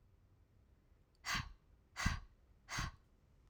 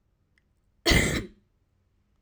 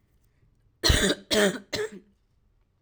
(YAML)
exhalation_length: 3.5 s
exhalation_amplitude: 3324
exhalation_signal_mean_std_ratio: 0.38
cough_length: 2.2 s
cough_amplitude: 14642
cough_signal_mean_std_ratio: 0.32
three_cough_length: 2.8 s
three_cough_amplitude: 14906
three_cough_signal_mean_std_ratio: 0.4
survey_phase: alpha (2021-03-01 to 2021-08-12)
age: 18-44
gender: Female
wearing_mask: 'No'
symptom_new_continuous_cough: true
symptom_fatigue: true
symptom_headache: true
symptom_onset: 8 days
smoker_status: Never smoked
respiratory_condition_asthma: true
respiratory_condition_other: false
recruitment_source: Test and Trace
submission_delay: 2 days
covid_test_result: Positive
covid_test_method: RT-qPCR
covid_ct_value: 33.9
covid_ct_gene: N gene